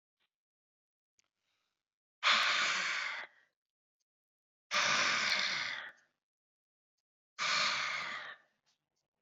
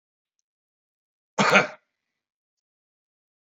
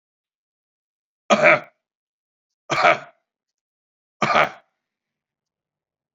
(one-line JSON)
{"exhalation_length": "9.2 s", "exhalation_amplitude": 5228, "exhalation_signal_mean_std_ratio": 0.46, "cough_length": "3.5 s", "cough_amplitude": 28039, "cough_signal_mean_std_ratio": 0.21, "three_cough_length": "6.1 s", "three_cough_amplitude": 29367, "three_cough_signal_mean_std_ratio": 0.27, "survey_phase": "beta (2021-08-13 to 2022-03-07)", "age": "65+", "gender": "Male", "wearing_mask": "No", "symptom_none": true, "smoker_status": "Ex-smoker", "respiratory_condition_asthma": false, "respiratory_condition_other": false, "recruitment_source": "REACT", "submission_delay": "2 days", "covid_test_result": "Negative", "covid_test_method": "RT-qPCR", "influenza_a_test_result": "Negative", "influenza_b_test_result": "Negative"}